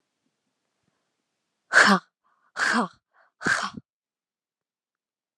{"exhalation_length": "5.4 s", "exhalation_amplitude": 26968, "exhalation_signal_mean_std_ratio": 0.27, "survey_phase": "beta (2021-08-13 to 2022-03-07)", "age": "18-44", "gender": "Female", "wearing_mask": "No", "symptom_cough_any": true, "symptom_new_continuous_cough": true, "symptom_runny_or_blocked_nose": true, "symptom_sore_throat": true, "symptom_other": true, "symptom_onset": "4 days", "smoker_status": "Never smoked", "respiratory_condition_asthma": false, "respiratory_condition_other": false, "recruitment_source": "Test and Trace", "submission_delay": "3 days", "covid_test_result": "Positive", "covid_test_method": "RT-qPCR", "covid_ct_value": 21.9, "covid_ct_gene": "N gene", "covid_ct_mean": 21.9, "covid_viral_load": "63000 copies/ml", "covid_viral_load_category": "Low viral load (10K-1M copies/ml)"}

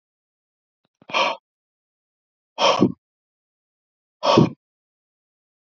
{"exhalation_length": "5.6 s", "exhalation_amplitude": 27458, "exhalation_signal_mean_std_ratio": 0.28, "survey_phase": "alpha (2021-03-01 to 2021-08-12)", "age": "18-44", "gender": "Male", "wearing_mask": "No", "symptom_none": true, "smoker_status": "Never smoked", "respiratory_condition_asthma": false, "respiratory_condition_other": false, "recruitment_source": "REACT", "submission_delay": "1 day", "covid_test_result": "Negative", "covid_test_method": "RT-qPCR"}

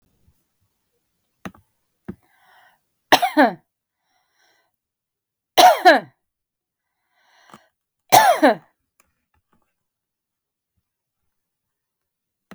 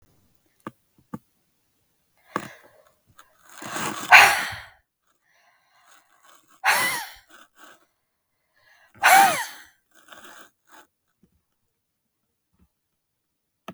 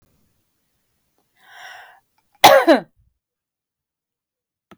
{"three_cough_length": "12.5 s", "three_cough_amplitude": 32766, "three_cough_signal_mean_std_ratio": 0.22, "exhalation_length": "13.7 s", "exhalation_amplitude": 32768, "exhalation_signal_mean_std_ratio": 0.23, "cough_length": "4.8 s", "cough_amplitude": 32768, "cough_signal_mean_std_ratio": 0.21, "survey_phase": "beta (2021-08-13 to 2022-03-07)", "age": "45-64", "gender": "Female", "wearing_mask": "No", "symptom_none": true, "smoker_status": "Never smoked", "respiratory_condition_asthma": true, "respiratory_condition_other": false, "recruitment_source": "REACT", "submission_delay": "2 days", "covid_test_result": "Negative", "covid_test_method": "RT-qPCR", "influenza_a_test_result": "Negative", "influenza_b_test_result": "Negative"}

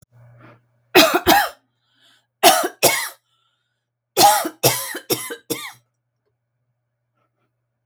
{"three_cough_length": "7.9 s", "three_cough_amplitude": 32768, "three_cough_signal_mean_std_ratio": 0.35, "survey_phase": "beta (2021-08-13 to 2022-03-07)", "age": "45-64", "gender": "Female", "wearing_mask": "No", "symptom_abdominal_pain": true, "symptom_diarrhoea": true, "symptom_onset": "18 days", "smoker_status": "Ex-smoker", "respiratory_condition_asthma": false, "respiratory_condition_other": false, "recruitment_source": "Test and Trace", "submission_delay": "1 day", "covid_test_result": "Negative", "covid_test_method": "RT-qPCR"}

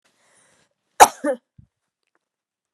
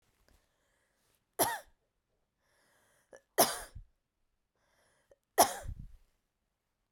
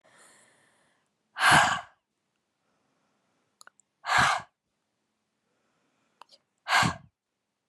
{"cough_length": "2.7 s", "cough_amplitude": 32768, "cough_signal_mean_std_ratio": 0.16, "three_cough_length": "6.9 s", "three_cough_amplitude": 10301, "three_cough_signal_mean_std_ratio": 0.21, "exhalation_length": "7.7 s", "exhalation_amplitude": 13557, "exhalation_signal_mean_std_ratio": 0.28, "survey_phase": "beta (2021-08-13 to 2022-03-07)", "age": "18-44", "gender": "Female", "wearing_mask": "No", "symptom_none": true, "symptom_onset": "8 days", "smoker_status": "Ex-smoker", "respiratory_condition_asthma": false, "respiratory_condition_other": false, "recruitment_source": "REACT", "submission_delay": "1 day", "covid_test_result": "Negative", "covid_test_method": "RT-qPCR"}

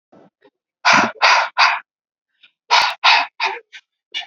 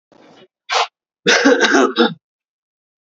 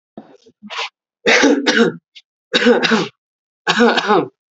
{"exhalation_length": "4.3 s", "exhalation_amplitude": 32768, "exhalation_signal_mean_std_ratio": 0.46, "cough_length": "3.1 s", "cough_amplitude": 31664, "cough_signal_mean_std_ratio": 0.46, "three_cough_length": "4.5 s", "three_cough_amplitude": 30938, "three_cough_signal_mean_std_ratio": 0.54, "survey_phase": "beta (2021-08-13 to 2022-03-07)", "age": "18-44", "gender": "Male", "wearing_mask": "No", "symptom_none": true, "smoker_status": "Never smoked", "respiratory_condition_asthma": false, "respiratory_condition_other": false, "recruitment_source": "REACT", "submission_delay": "3 days", "covid_test_result": "Negative", "covid_test_method": "RT-qPCR", "influenza_a_test_result": "Negative", "influenza_b_test_result": "Negative"}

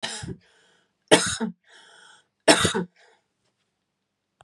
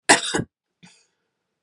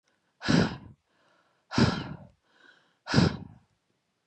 {"three_cough_length": "4.4 s", "three_cough_amplitude": 32541, "three_cough_signal_mean_std_ratio": 0.29, "cough_length": "1.6 s", "cough_amplitude": 32137, "cough_signal_mean_std_ratio": 0.28, "exhalation_length": "4.3 s", "exhalation_amplitude": 14477, "exhalation_signal_mean_std_ratio": 0.35, "survey_phase": "beta (2021-08-13 to 2022-03-07)", "age": "18-44", "gender": "Female", "wearing_mask": "No", "symptom_cough_any": true, "symptom_runny_or_blocked_nose": true, "symptom_shortness_of_breath": true, "symptom_sore_throat": true, "symptom_diarrhoea": true, "symptom_fatigue": true, "symptom_onset": "3 days", "smoker_status": "Ex-smoker", "respiratory_condition_asthma": false, "respiratory_condition_other": false, "recruitment_source": "Test and Trace", "submission_delay": "2 days", "covid_test_result": "Positive", "covid_test_method": "LAMP"}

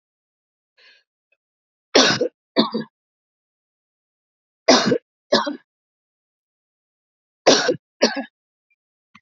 {"three_cough_length": "9.2 s", "three_cough_amplitude": 30846, "three_cough_signal_mean_std_ratio": 0.29, "survey_phase": "alpha (2021-03-01 to 2021-08-12)", "age": "65+", "gender": "Male", "wearing_mask": "No", "symptom_none": true, "smoker_status": "Ex-smoker", "respiratory_condition_asthma": false, "respiratory_condition_other": false, "recruitment_source": "REACT", "submission_delay": "2 days", "covid_test_result": "Negative", "covid_test_method": "RT-qPCR"}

